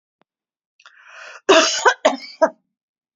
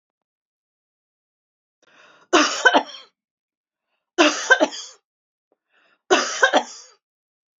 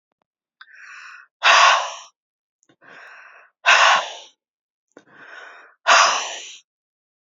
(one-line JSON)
{"cough_length": "3.2 s", "cough_amplitude": 28790, "cough_signal_mean_std_ratio": 0.34, "three_cough_length": "7.6 s", "three_cough_amplitude": 32767, "three_cough_signal_mean_std_ratio": 0.3, "exhalation_length": "7.3 s", "exhalation_amplitude": 31120, "exhalation_signal_mean_std_ratio": 0.35, "survey_phase": "beta (2021-08-13 to 2022-03-07)", "age": "45-64", "gender": "Female", "wearing_mask": "No", "symptom_none": true, "smoker_status": "Never smoked", "respiratory_condition_asthma": false, "respiratory_condition_other": false, "recruitment_source": "REACT", "submission_delay": "1 day", "covid_test_result": "Negative", "covid_test_method": "RT-qPCR", "influenza_a_test_result": "Negative", "influenza_b_test_result": "Negative"}